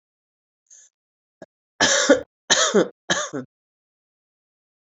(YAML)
three_cough_length: 4.9 s
three_cough_amplitude: 28302
three_cough_signal_mean_std_ratio: 0.33
survey_phase: beta (2021-08-13 to 2022-03-07)
age: 45-64
gender: Female
wearing_mask: 'No'
symptom_runny_or_blocked_nose: true
symptom_sore_throat: true
symptom_headache: true
symptom_onset: 3 days
smoker_status: Current smoker (1 to 10 cigarettes per day)
respiratory_condition_asthma: false
respiratory_condition_other: false
recruitment_source: Test and Trace
submission_delay: 2 days
covid_test_result: Positive
covid_test_method: RT-qPCR
covid_ct_value: 27.8
covid_ct_gene: N gene